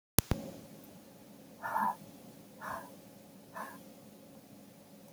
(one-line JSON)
{"exhalation_length": "5.1 s", "exhalation_amplitude": 32768, "exhalation_signal_mean_std_ratio": 0.38, "survey_phase": "beta (2021-08-13 to 2022-03-07)", "age": "65+", "gender": "Female", "wearing_mask": "No", "symptom_none": true, "smoker_status": "Ex-smoker", "respiratory_condition_asthma": false, "respiratory_condition_other": false, "recruitment_source": "REACT", "submission_delay": "3 days", "covid_test_result": "Negative", "covid_test_method": "RT-qPCR", "influenza_a_test_result": "Negative", "influenza_b_test_result": "Negative"}